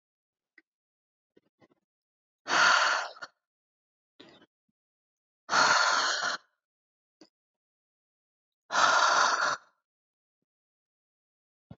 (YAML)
exhalation_length: 11.8 s
exhalation_amplitude: 10511
exhalation_signal_mean_std_ratio: 0.36
survey_phase: beta (2021-08-13 to 2022-03-07)
age: 18-44
gender: Female
wearing_mask: 'No'
symptom_cough_any: true
symptom_runny_or_blocked_nose: true
symptom_shortness_of_breath: true
symptom_sore_throat: true
symptom_fatigue: true
symptom_onset: 3 days
smoker_status: Ex-smoker
respiratory_condition_asthma: false
respiratory_condition_other: false
recruitment_source: Test and Trace
submission_delay: 1 day
covid_test_result: Positive
covid_test_method: RT-qPCR
covid_ct_value: 19.1
covid_ct_gene: ORF1ab gene